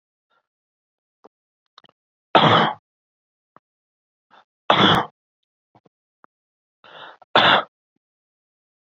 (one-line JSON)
{"three_cough_length": "8.9 s", "three_cough_amplitude": 30458, "three_cough_signal_mean_std_ratio": 0.26, "survey_phase": "beta (2021-08-13 to 2022-03-07)", "age": "45-64", "gender": "Male", "wearing_mask": "No", "symptom_sore_throat": true, "smoker_status": "Ex-smoker", "respiratory_condition_asthma": false, "respiratory_condition_other": false, "recruitment_source": "Test and Trace", "submission_delay": "2 days", "covid_test_result": "Positive", "covid_test_method": "ePCR"}